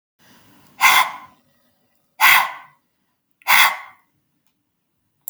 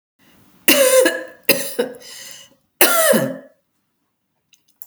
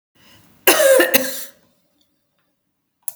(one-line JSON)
{"exhalation_length": "5.3 s", "exhalation_amplitude": 32767, "exhalation_signal_mean_std_ratio": 0.32, "three_cough_length": "4.9 s", "three_cough_amplitude": 32768, "three_cough_signal_mean_std_ratio": 0.43, "cough_length": "3.2 s", "cough_amplitude": 32768, "cough_signal_mean_std_ratio": 0.37, "survey_phase": "alpha (2021-03-01 to 2021-08-12)", "age": "65+", "gender": "Female", "wearing_mask": "No", "symptom_none": true, "smoker_status": "Never smoked", "respiratory_condition_asthma": false, "respiratory_condition_other": false, "recruitment_source": "REACT", "submission_delay": "1 day", "covid_test_result": "Negative", "covid_test_method": "RT-qPCR"}